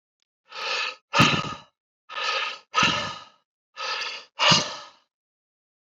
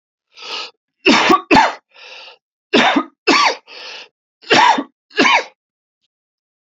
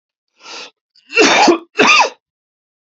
{"exhalation_length": "5.8 s", "exhalation_amplitude": 22876, "exhalation_signal_mean_std_ratio": 0.46, "three_cough_length": "6.7 s", "three_cough_amplitude": 31944, "three_cough_signal_mean_std_ratio": 0.45, "cough_length": "3.0 s", "cough_amplitude": 31508, "cough_signal_mean_std_ratio": 0.44, "survey_phase": "beta (2021-08-13 to 2022-03-07)", "age": "45-64", "gender": "Male", "wearing_mask": "No", "symptom_cough_any": true, "symptom_new_continuous_cough": true, "symptom_shortness_of_breath": true, "symptom_sore_throat": true, "symptom_fatigue": true, "symptom_fever_high_temperature": true, "symptom_headache": true, "symptom_change_to_sense_of_smell_or_taste": true, "symptom_loss_of_taste": true, "symptom_onset": "3 days", "smoker_status": "Ex-smoker", "respiratory_condition_asthma": false, "respiratory_condition_other": false, "recruitment_source": "Test and Trace", "submission_delay": "1 day", "covid_test_result": "Positive", "covid_test_method": "RT-qPCR", "covid_ct_value": 18.4, "covid_ct_gene": "ORF1ab gene", "covid_ct_mean": 19.3, "covid_viral_load": "480000 copies/ml", "covid_viral_load_category": "Low viral load (10K-1M copies/ml)"}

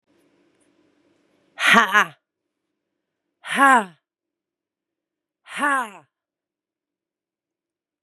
{"exhalation_length": "8.0 s", "exhalation_amplitude": 32767, "exhalation_signal_mean_std_ratio": 0.26, "survey_phase": "beta (2021-08-13 to 2022-03-07)", "age": "45-64", "gender": "Female", "wearing_mask": "No", "symptom_cough_any": true, "symptom_runny_or_blocked_nose": true, "symptom_sore_throat": true, "symptom_abdominal_pain": true, "symptom_fatigue": true, "symptom_fever_high_temperature": true, "symptom_headache": true, "symptom_change_to_sense_of_smell_or_taste": true, "symptom_loss_of_taste": true, "symptom_onset": "2 days", "smoker_status": "Current smoker (1 to 10 cigarettes per day)", "respiratory_condition_asthma": false, "respiratory_condition_other": false, "recruitment_source": "Test and Trace", "submission_delay": "2 days", "covid_test_result": "Positive", "covid_test_method": "RT-qPCR", "covid_ct_value": 23.5, "covid_ct_gene": "N gene"}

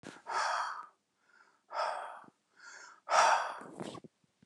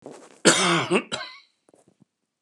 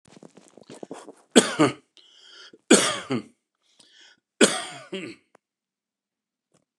{"exhalation_length": "4.5 s", "exhalation_amplitude": 6949, "exhalation_signal_mean_std_ratio": 0.45, "cough_length": "2.4 s", "cough_amplitude": 27007, "cough_signal_mean_std_ratio": 0.41, "three_cough_length": "6.8 s", "three_cough_amplitude": 29204, "three_cough_signal_mean_std_ratio": 0.27, "survey_phase": "beta (2021-08-13 to 2022-03-07)", "age": "65+", "gender": "Male", "wearing_mask": "No", "symptom_none": true, "smoker_status": "Ex-smoker", "respiratory_condition_asthma": false, "respiratory_condition_other": false, "recruitment_source": "REACT", "submission_delay": "0 days", "covid_test_result": "Negative", "covid_test_method": "RT-qPCR", "influenza_a_test_result": "Negative", "influenza_b_test_result": "Negative"}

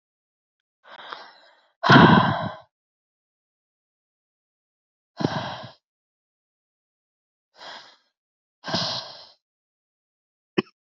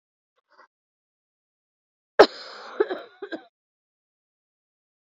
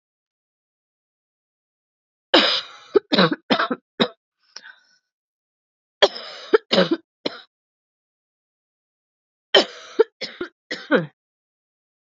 {"exhalation_length": "10.8 s", "exhalation_amplitude": 26697, "exhalation_signal_mean_std_ratio": 0.23, "cough_length": "5.0 s", "cough_amplitude": 26965, "cough_signal_mean_std_ratio": 0.15, "three_cough_length": "12.0 s", "three_cough_amplitude": 29438, "three_cough_signal_mean_std_ratio": 0.27, "survey_phase": "beta (2021-08-13 to 2022-03-07)", "age": "18-44", "gender": "Female", "wearing_mask": "No", "symptom_new_continuous_cough": true, "symptom_runny_or_blocked_nose": true, "symptom_sore_throat": true, "symptom_fatigue": true, "symptom_change_to_sense_of_smell_or_taste": true, "symptom_other": true, "symptom_onset": "6 days", "smoker_status": "Ex-smoker", "respiratory_condition_asthma": false, "respiratory_condition_other": false, "recruitment_source": "Test and Trace", "submission_delay": "2 days", "covid_test_result": "Positive", "covid_test_method": "RT-qPCR"}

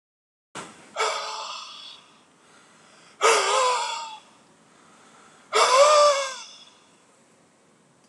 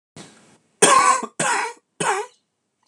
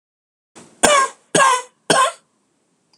{"exhalation_length": "8.1 s", "exhalation_amplitude": 19403, "exhalation_signal_mean_std_ratio": 0.42, "cough_length": "2.9 s", "cough_amplitude": 26028, "cough_signal_mean_std_ratio": 0.45, "three_cough_length": "3.0 s", "three_cough_amplitude": 26028, "three_cough_signal_mean_std_ratio": 0.42, "survey_phase": "alpha (2021-03-01 to 2021-08-12)", "age": "45-64", "gender": "Male", "wearing_mask": "No", "symptom_cough_any": true, "symptom_headache": true, "symptom_change_to_sense_of_smell_or_taste": true, "smoker_status": "Ex-smoker", "respiratory_condition_asthma": false, "respiratory_condition_other": false, "recruitment_source": "Test and Trace", "submission_delay": "3 days", "covid_test_result": "Positive", "covid_test_method": "RT-qPCR"}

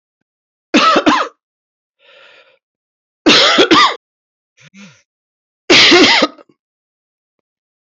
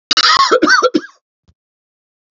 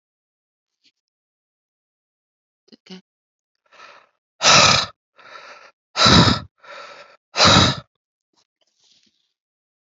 {"three_cough_length": "7.9 s", "three_cough_amplitude": 32768, "three_cough_signal_mean_std_ratio": 0.41, "cough_length": "2.3 s", "cough_amplitude": 31335, "cough_signal_mean_std_ratio": 0.5, "exhalation_length": "9.8 s", "exhalation_amplitude": 32767, "exhalation_signal_mean_std_ratio": 0.29, "survey_phase": "alpha (2021-03-01 to 2021-08-12)", "age": "45-64", "gender": "Male", "wearing_mask": "No", "symptom_cough_any": true, "symptom_new_continuous_cough": true, "symptom_fever_high_temperature": true, "symptom_headache": true, "symptom_onset": "4 days", "smoker_status": "Current smoker (e-cigarettes or vapes only)", "respiratory_condition_asthma": false, "respiratory_condition_other": false, "recruitment_source": "Test and Trace", "submission_delay": "3 days", "covid_test_result": "Positive", "covid_test_method": "RT-qPCR", "covid_ct_value": 14.4, "covid_ct_gene": "ORF1ab gene", "covid_ct_mean": 15.5, "covid_viral_load": "8500000 copies/ml", "covid_viral_load_category": "High viral load (>1M copies/ml)"}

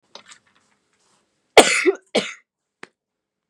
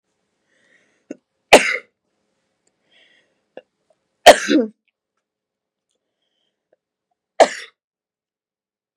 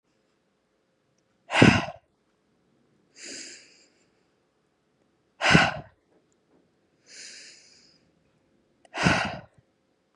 {"cough_length": "3.5 s", "cough_amplitude": 32768, "cough_signal_mean_std_ratio": 0.24, "three_cough_length": "9.0 s", "three_cough_amplitude": 32768, "three_cough_signal_mean_std_ratio": 0.18, "exhalation_length": "10.2 s", "exhalation_amplitude": 28102, "exhalation_signal_mean_std_ratio": 0.24, "survey_phase": "beta (2021-08-13 to 2022-03-07)", "age": "18-44", "gender": "Female", "wearing_mask": "No", "symptom_none": true, "smoker_status": "Never smoked", "respiratory_condition_asthma": false, "respiratory_condition_other": false, "recruitment_source": "REACT", "submission_delay": "3 days", "covid_test_result": "Negative", "covid_test_method": "RT-qPCR", "influenza_a_test_result": "Negative", "influenza_b_test_result": "Negative"}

